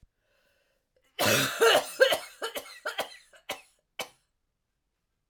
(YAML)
cough_length: 5.3 s
cough_amplitude: 15187
cough_signal_mean_std_ratio: 0.36
survey_phase: alpha (2021-03-01 to 2021-08-12)
age: 18-44
gender: Female
wearing_mask: 'No'
symptom_new_continuous_cough: true
symptom_shortness_of_breath: true
symptom_fatigue: true
symptom_onset: 3 days
smoker_status: Never smoked
respiratory_condition_asthma: false
respiratory_condition_other: false
recruitment_source: Test and Trace
submission_delay: 2 days
covid_test_result: Positive
covid_test_method: RT-qPCR
covid_ct_value: 24.4
covid_ct_gene: ORF1ab gene
covid_ct_mean: 25.2
covid_viral_load: 5400 copies/ml
covid_viral_load_category: Minimal viral load (< 10K copies/ml)